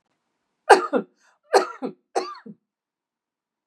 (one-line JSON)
{"three_cough_length": "3.7 s", "three_cough_amplitude": 32717, "three_cough_signal_mean_std_ratio": 0.25, "survey_phase": "beta (2021-08-13 to 2022-03-07)", "age": "45-64", "gender": "Female", "wearing_mask": "No", "symptom_none": true, "symptom_onset": "9 days", "smoker_status": "Never smoked", "respiratory_condition_asthma": true, "respiratory_condition_other": false, "recruitment_source": "REACT", "submission_delay": "3 days", "covid_test_result": "Positive", "covid_test_method": "RT-qPCR", "covid_ct_value": 30.0, "covid_ct_gene": "E gene"}